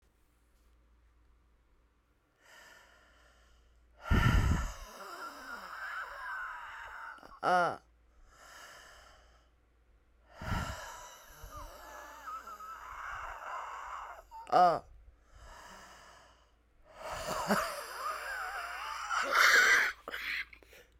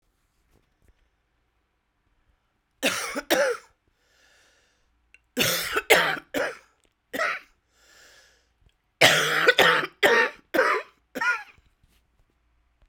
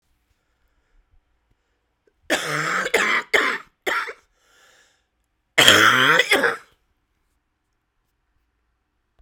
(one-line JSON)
{"exhalation_length": "21.0 s", "exhalation_amplitude": 9412, "exhalation_signal_mean_std_ratio": 0.43, "three_cough_length": "12.9 s", "three_cough_amplitude": 32767, "three_cough_signal_mean_std_ratio": 0.38, "cough_length": "9.2 s", "cough_amplitude": 32768, "cough_signal_mean_std_ratio": 0.36, "survey_phase": "beta (2021-08-13 to 2022-03-07)", "age": "45-64", "gender": "Female", "wearing_mask": "No", "symptom_cough_any": true, "symptom_runny_or_blocked_nose": true, "symptom_shortness_of_breath": true, "symptom_sore_throat": true, "symptom_abdominal_pain": true, "symptom_fatigue": true, "symptom_headache": true, "symptom_change_to_sense_of_smell_or_taste": true, "symptom_loss_of_taste": true, "symptom_other": true, "smoker_status": "Ex-smoker", "respiratory_condition_asthma": false, "respiratory_condition_other": false, "recruitment_source": "Test and Trace", "submission_delay": "4 days", "covid_test_result": "Positive", "covid_test_method": "RT-qPCR", "covid_ct_value": 17.7, "covid_ct_gene": "ORF1ab gene", "covid_ct_mean": 18.5, "covid_viral_load": "860000 copies/ml", "covid_viral_load_category": "Low viral load (10K-1M copies/ml)"}